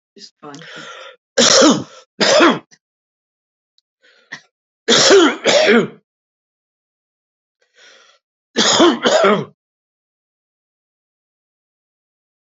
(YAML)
three_cough_length: 12.5 s
three_cough_amplitude: 32767
three_cough_signal_mean_std_ratio: 0.38
survey_phase: beta (2021-08-13 to 2022-03-07)
age: 65+
gender: Male
wearing_mask: 'No'
symptom_cough_any: true
symptom_shortness_of_breath: true
symptom_onset: 6 days
smoker_status: Never smoked
respiratory_condition_asthma: false
respiratory_condition_other: false
recruitment_source: Test and Trace
submission_delay: 2 days
covid_test_result: Positive
covid_test_method: RT-qPCR
covid_ct_value: 25.9
covid_ct_gene: N gene
covid_ct_mean: 26.0
covid_viral_load: 3000 copies/ml
covid_viral_load_category: Minimal viral load (< 10K copies/ml)